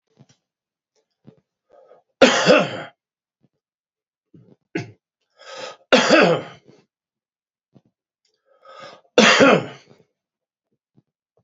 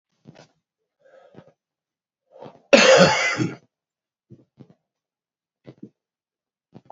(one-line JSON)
{"three_cough_length": "11.4 s", "three_cough_amplitude": 30335, "three_cough_signal_mean_std_ratio": 0.29, "cough_length": "6.9 s", "cough_amplitude": 32768, "cough_signal_mean_std_ratio": 0.25, "survey_phase": "alpha (2021-03-01 to 2021-08-12)", "age": "65+", "gender": "Male", "wearing_mask": "No", "symptom_cough_any": true, "symptom_fatigue": true, "smoker_status": "Never smoked", "respiratory_condition_asthma": false, "respiratory_condition_other": false, "recruitment_source": "Test and Trace", "submission_delay": "2 days", "covid_test_result": "Positive", "covid_test_method": "RT-qPCR"}